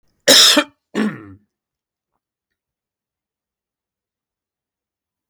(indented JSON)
{
  "cough_length": "5.3 s",
  "cough_amplitude": 32767,
  "cough_signal_mean_std_ratio": 0.24,
  "survey_phase": "beta (2021-08-13 to 2022-03-07)",
  "age": "65+",
  "gender": "Male",
  "wearing_mask": "No",
  "symptom_none": true,
  "smoker_status": "Never smoked",
  "respiratory_condition_asthma": false,
  "respiratory_condition_other": false,
  "recruitment_source": "REACT",
  "submission_delay": "1 day",
  "covid_test_result": "Negative",
  "covid_test_method": "RT-qPCR"
}